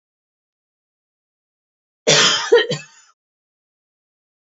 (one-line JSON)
{"cough_length": "4.4 s", "cough_amplitude": 29217, "cough_signal_mean_std_ratio": 0.29, "survey_phase": "alpha (2021-03-01 to 2021-08-12)", "age": "65+", "gender": "Female", "wearing_mask": "No", "symptom_cough_any": true, "symptom_headache": true, "symptom_onset": "12 days", "smoker_status": "Never smoked", "respiratory_condition_asthma": false, "respiratory_condition_other": false, "recruitment_source": "REACT", "submission_delay": "2 days", "covid_test_result": "Negative", "covid_test_method": "RT-qPCR"}